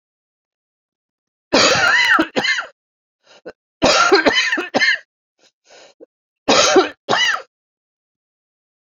{"three_cough_length": "8.9 s", "three_cough_amplitude": 32767, "three_cough_signal_mean_std_ratio": 0.46, "survey_phase": "beta (2021-08-13 to 2022-03-07)", "age": "45-64", "gender": "Female", "wearing_mask": "No", "symptom_cough_any": true, "symptom_runny_or_blocked_nose": true, "symptom_headache": true, "symptom_onset": "4 days", "smoker_status": "Ex-smoker", "respiratory_condition_asthma": false, "respiratory_condition_other": false, "recruitment_source": "Test and Trace", "submission_delay": "1 day", "covid_test_result": "Positive", "covid_test_method": "RT-qPCR", "covid_ct_value": 23.1, "covid_ct_gene": "ORF1ab gene"}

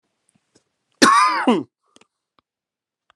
{"cough_length": "3.2 s", "cough_amplitude": 32768, "cough_signal_mean_std_ratio": 0.34, "survey_phase": "alpha (2021-03-01 to 2021-08-12)", "age": "45-64", "gender": "Male", "wearing_mask": "No", "symptom_none": true, "smoker_status": "Ex-smoker", "respiratory_condition_asthma": true, "respiratory_condition_other": false, "recruitment_source": "REACT", "submission_delay": "35 days", "covid_test_result": "Negative", "covid_test_method": "RT-qPCR"}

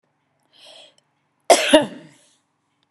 {"cough_length": "2.9 s", "cough_amplitude": 32767, "cough_signal_mean_std_ratio": 0.25, "survey_phase": "beta (2021-08-13 to 2022-03-07)", "age": "65+", "gender": "Female", "wearing_mask": "No", "symptom_none": true, "smoker_status": "Never smoked", "respiratory_condition_asthma": false, "respiratory_condition_other": false, "recruitment_source": "REACT", "submission_delay": "1 day", "covid_test_result": "Negative", "covid_test_method": "RT-qPCR", "influenza_a_test_result": "Negative", "influenza_b_test_result": "Negative"}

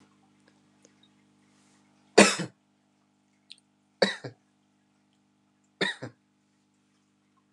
{"three_cough_length": "7.5 s", "three_cough_amplitude": 25908, "three_cough_signal_mean_std_ratio": 0.17, "survey_phase": "alpha (2021-03-01 to 2021-08-12)", "age": "18-44", "gender": "Male", "wearing_mask": "No", "symptom_none": true, "smoker_status": "Never smoked", "respiratory_condition_asthma": false, "respiratory_condition_other": false, "recruitment_source": "REACT", "submission_delay": "3 days", "covid_test_result": "Negative", "covid_test_method": "RT-qPCR"}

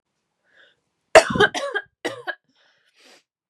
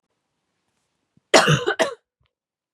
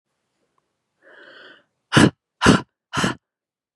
{"three_cough_length": "3.5 s", "three_cough_amplitude": 32768, "three_cough_signal_mean_std_ratio": 0.25, "cough_length": "2.7 s", "cough_amplitude": 32763, "cough_signal_mean_std_ratio": 0.3, "exhalation_length": "3.8 s", "exhalation_amplitude": 31931, "exhalation_signal_mean_std_ratio": 0.27, "survey_phase": "beta (2021-08-13 to 2022-03-07)", "age": "18-44", "gender": "Female", "wearing_mask": "No", "symptom_cough_any": true, "symptom_new_continuous_cough": true, "symptom_runny_or_blocked_nose": true, "symptom_shortness_of_breath": true, "symptom_sore_throat": true, "symptom_fatigue": true, "smoker_status": "Never smoked", "respiratory_condition_asthma": false, "respiratory_condition_other": false, "recruitment_source": "Test and Trace", "submission_delay": "1 day", "covid_test_result": "Positive", "covid_test_method": "RT-qPCR", "covid_ct_value": 15.5, "covid_ct_gene": "N gene", "covid_ct_mean": 15.6, "covid_viral_load": "7500000 copies/ml", "covid_viral_load_category": "High viral load (>1M copies/ml)"}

